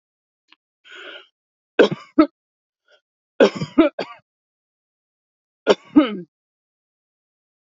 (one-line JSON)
{"three_cough_length": "7.8 s", "three_cough_amplitude": 31814, "three_cough_signal_mean_std_ratio": 0.24, "survey_phase": "alpha (2021-03-01 to 2021-08-12)", "age": "18-44", "gender": "Female", "wearing_mask": "No", "symptom_none": true, "smoker_status": "Ex-smoker", "respiratory_condition_asthma": false, "respiratory_condition_other": false, "recruitment_source": "REACT", "submission_delay": "1 day", "covid_test_result": "Negative", "covid_test_method": "RT-qPCR"}